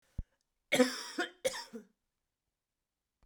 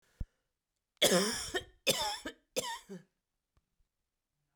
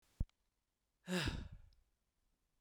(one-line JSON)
{"cough_length": "3.3 s", "cough_amplitude": 7227, "cough_signal_mean_std_ratio": 0.3, "three_cough_length": "4.6 s", "three_cough_amplitude": 7356, "three_cough_signal_mean_std_ratio": 0.37, "exhalation_length": "2.6 s", "exhalation_amplitude": 1950, "exhalation_signal_mean_std_ratio": 0.33, "survey_phase": "beta (2021-08-13 to 2022-03-07)", "age": "45-64", "gender": "Female", "wearing_mask": "No", "symptom_cough_any": true, "symptom_runny_or_blocked_nose": true, "symptom_fatigue": true, "symptom_headache": true, "symptom_change_to_sense_of_smell_or_taste": true, "symptom_loss_of_taste": true, "symptom_onset": "9 days", "smoker_status": "Current smoker (e-cigarettes or vapes only)", "respiratory_condition_asthma": false, "respiratory_condition_other": false, "recruitment_source": "Test and Trace", "submission_delay": "2 days", "covid_test_result": "Positive", "covid_test_method": "RT-qPCR"}